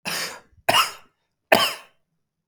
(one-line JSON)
{"three_cough_length": "2.5 s", "three_cough_amplitude": 32132, "three_cough_signal_mean_std_ratio": 0.36, "survey_phase": "beta (2021-08-13 to 2022-03-07)", "age": "45-64", "gender": "Male", "wearing_mask": "No", "symptom_cough_any": true, "symptom_runny_or_blocked_nose": true, "symptom_sore_throat": true, "symptom_fatigue": true, "symptom_headache": true, "symptom_change_to_sense_of_smell_or_taste": true, "symptom_other": true, "smoker_status": "Never smoked", "respiratory_condition_asthma": false, "respiratory_condition_other": false, "recruitment_source": "Test and Trace", "submission_delay": "2 days", "covid_test_result": "Positive", "covid_test_method": "RT-qPCR", "covid_ct_value": 24.5, "covid_ct_gene": "ORF1ab gene", "covid_ct_mean": 25.3, "covid_viral_load": "5100 copies/ml", "covid_viral_load_category": "Minimal viral load (< 10K copies/ml)"}